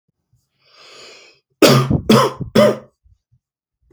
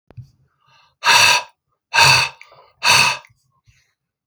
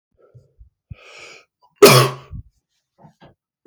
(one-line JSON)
{"three_cough_length": "3.9 s", "three_cough_amplitude": 32768, "three_cough_signal_mean_std_ratio": 0.37, "exhalation_length": "4.3 s", "exhalation_amplitude": 32768, "exhalation_signal_mean_std_ratio": 0.41, "cough_length": "3.7 s", "cough_amplitude": 32768, "cough_signal_mean_std_ratio": 0.23, "survey_phase": "beta (2021-08-13 to 2022-03-07)", "age": "18-44", "gender": "Male", "wearing_mask": "No", "symptom_none": true, "smoker_status": "Never smoked", "respiratory_condition_asthma": false, "respiratory_condition_other": false, "recruitment_source": "REACT", "submission_delay": "1 day", "covid_test_result": "Negative", "covid_test_method": "RT-qPCR", "influenza_a_test_result": "Negative", "influenza_b_test_result": "Negative"}